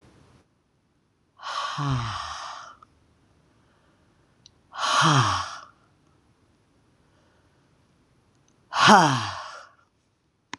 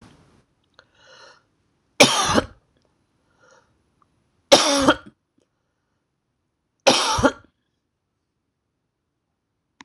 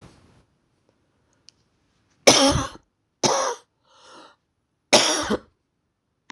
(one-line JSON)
{"exhalation_length": "10.6 s", "exhalation_amplitude": 26023, "exhalation_signal_mean_std_ratio": 0.33, "three_cough_length": "9.8 s", "three_cough_amplitude": 26028, "three_cough_signal_mean_std_ratio": 0.26, "cough_length": "6.3 s", "cough_amplitude": 26028, "cough_signal_mean_std_ratio": 0.31, "survey_phase": "beta (2021-08-13 to 2022-03-07)", "age": "65+", "gender": "Female", "wearing_mask": "No", "symptom_cough_any": true, "smoker_status": "Current smoker (1 to 10 cigarettes per day)", "respiratory_condition_asthma": false, "respiratory_condition_other": false, "recruitment_source": "REACT", "submission_delay": "2 days", "covid_test_result": "Negative", "covid_test_method": "RT-qPCR", "influenza_a_test_result": "Negative", "influenza_b_test_result": "Negative"}